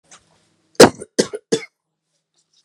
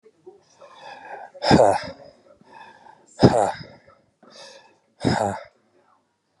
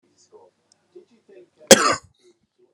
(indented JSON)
{
  "three_cough_length": "2.6 s",
  "three_cough_amplitude": 32768,
  "three_cough_signal_mean_std_ratio": 0.21,
  "exhalation_length": "6.4 s",
  "exhalation_amplitude": 32767,
  "exhalation_signal_mean_std_ratio": 0.32,
  "cough_length": "2.7 s",
  "cough_amplitude": 32768,
  "cough_signal_mean_std_ratio": 0.2,
  "survey_phase": "beta (2021-08-13 to 2022-03-07)",
  "age": "45-64",
  "gender": "Male",
  "wearing_mask": "No",
  "symptom_none": true,
  "symptom_onset": "12 days",
  "smoker_status": "Never smoked",
  "respiratory_condition_asthma": false,
  "respiratory_condition_other": false,
  "recruitment_source": "REACT",
  "submission_delay": "2 days",
  "covid_test_result": "Negative",
  "covid_test_method": "RT-qPCR"
}